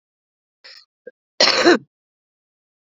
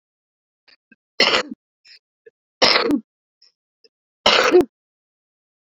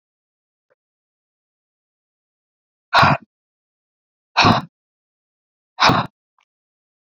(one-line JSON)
{"cough_length": "3.0 s", "cough_amplitude": 32768, "cough_signal_mean_std_ratio": 0.27, "three_cough_length": "5.7 s", "three_cough_amplitude": 32767, "three_cough_signal_mean_std_ratio": 0.32, "exhalation_length": "7.1 s", "exhalation_amplitude": 29199, "exhalation_signal_mean_std_ratio": 0.25, "survey_phase": "beta (2021-08-13 to 2022-03-07)", "age": "45-64", "gender": "Female", "wearing_mask": "No", "symptom_new_continuous_cough": true, "symptom_runny_or_blocked_nose": true, "symptom_shortness_of_breath": true, "symptom_diarrhoea": true, "symptom_headache": true, "symptom_change_to_sense_of_smell_or_taste": true, "symptom_loss_of_taste": true, "symptom_onset": "3 days", "smoker_status": "Current smoker (11 or more cigarettes per day)", "respiratory_condition_asthma": false, "respiratory_condition_other": false, "recruitment_source": "Test and Trace", "submission_delay": "2 days", "covid_test_result": "Positive", "covid_test_method": "ePCR"}